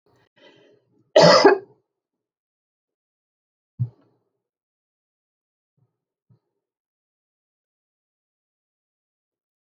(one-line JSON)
{"cough_length": "9.7 s", "cough_amplitude": 29626, "cough_signal_mean_std_ratio": 0.17, "survey_phase": "beta (2021-08-13 to 2022-03-07)", "age": "65+", "gender": "Female", "wearing_mask": "No", "symptom_none": true, "smoker_status": "Never smoked", "respiratory_condition_asthma": false, "respiratory_condition_other": false, "recruitment_source": "REACT", "submission_delay": "2 days", "covid_test_result": "Negative", "covid_test_method": "RT-qPCR"}